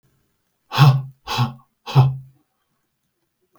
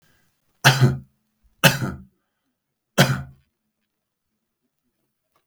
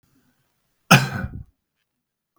{"exhalation_length": "3.6 s", "exhalation_amplitude": 32324, "exhalation_signal_mean_std_ratio": 0.35, "three_cough_length": "5.5 s", "three_cough_amplitude": 32768, "three_cough_signal_mean_std_ratio": 0.27, "cough_length": "2.4 s", "cough_amplitude": 32768, "cough_signal_mean_std_ratio": 0.23, "survey_phase": "beta (2021-08-13 to 2022-03-07)", "age": "45-64", "gender": "Male", "wearing_mask": "No", "symptom_none": true, "smoker_status": "Never smoked", "respiratory_condition_asthma": false, "respiratory_condition_other": false, "recruitment_source": "REACT", "submission_delay": "2 days", "covid_test_result": "Negative", "covid_test_method": "RT-qPCR", "influenza_a_test_result": "Negative", "influenza_b_test_result": "Negative"}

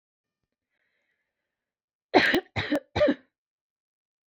{"three_cough_length": "4.3 s", "three_cough_amplitude": 21300, "three_cough_signal_mean_std_ratio": 0.3, "survey_phase": "beta (2021-08-13 to 2022-03-07)", "age": "18-44", "gender": "Female", "wearing_mask": "No", "symptom_runny_or_blocked_nose": true, "symptom_sore_throat": true, "smoker_status": "Never smoked", "respiratory_condition_asthma": false, "respiratory_condition_other": false, "recruitment_source": "Test and Trace", "submission_delay": "2 days", "covid_test_result": "Negative", "covid_test_method": "RT-qPCR"}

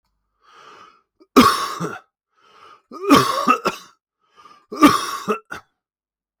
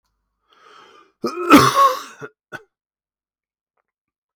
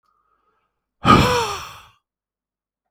{"three_cough_length": "6.4 s", "three_cough_amplitude": 32768, "three_cough_signal_mean_std_ratio": 0.36, "cough_length": "4.4 s", "cough_amplitude": 32768, "cough_signal_mean_std_ratio": 0.29, "exhalation_length": "2.9 s", "exhalation_amplitude": 32768, "exhalation_signal_mean_std_ratio": 0.32, "survey_phase": "beta (2021-08-13 to 2022-03-07)", "age": "45-64", "gender": "Male", "wearing_mask": "No", "symptom_runny_or_blocked_nose": true, "symptom_shortness_of_breath": true, "symptom_sore_throat": true, "symptom_fatigue": true, "symptom_change_to_sense_of_smell_or_taste": true, "symptom_onset": "3 days", "smoker_status": "Never smoked", "respiratory_condition_asthma": false, "respiratory_condition_other": false, "recruitment_source": "Test and Trace", "submission_delay": "1 day", "covid_test_result": "Positive", "covid_test_method": "ePCR"}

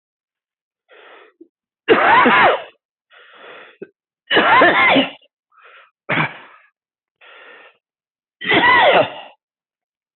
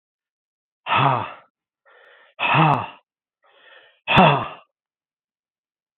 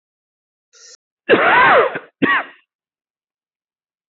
{"three_cough_length": "10.2 s", "three_cough_amplitude": 27472, "three_cough_signal_mean_std_ratio": 0.42, "exhalation_length": "6.0 s", "exhalation_amplitude": 26643, "exhalation_signal_mean_std_ratio": 0.35, "cough_length": "4.1 s", "cough_amplitude": 26585, "cough_signal_mean_std_ratio": 0.39, "survey_phase": "beta (2021-08-13 to 2022-03-07)", "age": "45-64", "gender": "Male", "wearing_mask": "No", "symptom_runny_or_blocked_nose": true, "symptom_fatigue": true, "symptom_fever_high_temperature": true, "symptom_headache": true, "symptom_onset": "3 days", "smoker_status": "Never smoked", "respiratory_condition_asthma": false, "respiratory_condition_other": false, "recruitment_source": "Test and Trace", "submission_delay": "2 days", "covid_test_result": "Positive", "covid_test_method": "ePCR"}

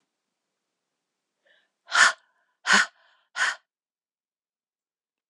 {"exhalation_length": "5.3 s", "exhalation_amplitude": 22629, "exhalation_signal_mean_std_ratio": 0.24, "survey_phase": "alpha (2021-03-01 to 2021-08-12)", "age": "45-64", "gender": "Female", "wearing_mask": "No", "symptom_cough_any": true, "symptom_new_continuous_cough": true, "symptom_fatigue": true, "symptom_headache": true, "symptom_change_to_sense_of_smell_or_taste": true, "smoker_status": "Ex-smoker", "respiratory_condition_asthma": false, "respiratory_condition_other": false, "recruitment_source": "Test and Trace", "submission_delay": "2 days", "covid_test_result": "Positive", "covid_test_method": "LFT"}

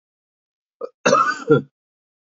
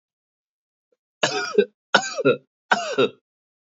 {"cough_length": "2.2 s", "cough_amplitude": 26362, "cough_signal_mean_std_ratio": 0.36, "three_cough_length": "3.7 s", "three_cough_amplitude": 27355, "three_cough_signal_mean_std_ratio": 0.37, "survey_phase": "beta (2021-08-13 to 2022-03-07)", "age": "18-44", "gender": "Male", "wearing_mask": "No", "symptom_cough_any": true, "symptom_runny_or_blocked_nose": true, "smoker_status": "Ex-smoker", "respiratory_condition_asthma": false, "respiratory_condition_other": false, "recruitment_source": "Test and Trace", "submission_delay": "-1 day", "covid_test_result": "Negative", "covid_test_method": "LFT"}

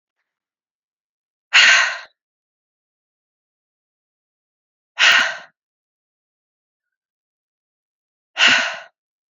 {"exhalation_length": "9.3 s", "exhalation_amplitude": 32767, "exhalation_signal_mean_std_ratio": 0.27, "survey_phase": "beta (2021-08-13 to 2022-03-07)", "age": "18-44", "gender": "Female", "wearing_mask": "No", "symptom_cough_any": true, "symptom_runny_or_blocked_nose": true, "symptom_shortness_of_breath": true, "symptom_sore_throat": true, "symptom_abdominal_pain": true, "symptom_diarrhoea": true, "symptom_fatigue": true, "symptom_headache": true, "symptom_change_to_sense_of_smell_or_taste": true, "smoker_status": "Never smoked", "respiratory_condition_asthma": true, "respiratory_condition_other": false, "recruitment_source": "Test and Trace", "submission_delay": "1 day", "covid_test_result": "Positive", "covid_test_method": "RT-qPCR", "covid_ct_value": 29.5, "covid_ct_gene": "ORF1ab gene", "covid_ct_mean": 29.8, "covid_viral_load": "160 copies/ml", "covid_viral_load_category": "Minimal viral load (< 10K copies/ml)"}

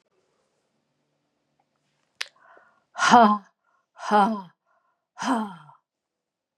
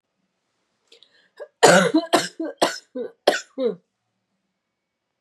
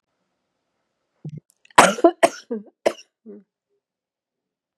{"exhalation_length": "6.6 s", "exhalation_amplitude": 27202, "exhalation_signal_mean_std_ratio": 0.28, "three_cough_length": "5.2 s", "three_cough_amplitude": 31837, "three_cough_signal_mean_std_ratio": 0.33, "cough_length": "4.8 s", "cough_amplitude": 32768, "cough_signal_mean_std_ratio": 0.21, "survey_phase": "beta (2021-08-13 to 2022-03-07)", "age": "45-64", "gender": "Female", "wearing_mask": "No", "symptom_new_continuous_cough": true, "symptom_runny_or_blocked_nose": true, "symptom_headache": true, "symptom_change_to_sense_of_smell_or_taste": true, "symptom_loss_of_taste": true, "symptom_onset": "6 days", "smoker_status": "Never smoked", "respiratory_condition_asthma": false, "respiratory_condition_other": false, "recruitment_source": "Test and Trace", "submission_delay": "1 day", "covid_test_result": "Positive", "covid_test_method": "RT-qPCR", "covid_ct_value": 9.9, "covid_ct_gene": "ORF1ab gene"}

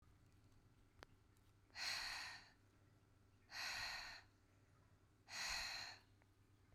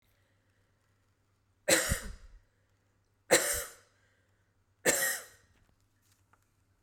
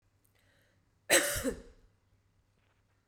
{"exhalation_length": "6.7 s", "exhalation_amplitude": 703, "exhalation_signal_mean_std_ratio": 0.55, "three_cough_length": "6.8 s", "three_cough_amplitude": 10953, "three_cough_signal_mean_std_ratio": 0.3, "cough_length": "3.1 s", "cough_amplitude": 10755, "cough_signal_mean_std_ratio": 0.28, "survey_phase": "beta (2021-08-13 to 2022-03-07)", "age": "45-64", "gender": "Female", "wearing_mask": "No", "symptom_cough_any": true, "symptom_runny_or_blocked_nose": true, "symptom_sore_throat": true, "symptom_fatigue": true, "symptom_headache": true, "symptom_loss_of_taste": true, "symptom_other": true, "symptom_onset": "3 days", "smoker_status": "Ex-smoker", "respiratory_condition_asthma": false, "respiratory_condition_other": false, "recruitment_source": "Test and Trace", "submission_delay": "2 days", "covid_test_result": "Positive", "covid_test_method": "RT-qPCR"}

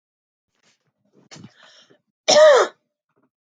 {"cough_length": "3.4 s", "cough_amplitude": 31797, "cough_signal_mean_std_ratio": 0.29, "survey_phase": "beta (2021-08-13 to 2022-03-07)", "age": "18-44", "gender": "Female", "wearing_mask": "No", "symptom_runny_or_blocked_nose": true, "symptom_sore_throat": true, "symptom_onset": "6 days", "smoker_status": "Ex-smoker", "respiratory_condition_asthma": false, "respiratory_condition_other": false, "recruitment_source": "REACT", "submission_delay": "1 day", "covid_test_result": "Positive", "covid_test_method": "RT-qPCR", "covid_ct_value": 22.8, "covid_ct_gene": "E gene", "influenza_a_test_result": "Negative", "influenza_b_test_result": "Negative"}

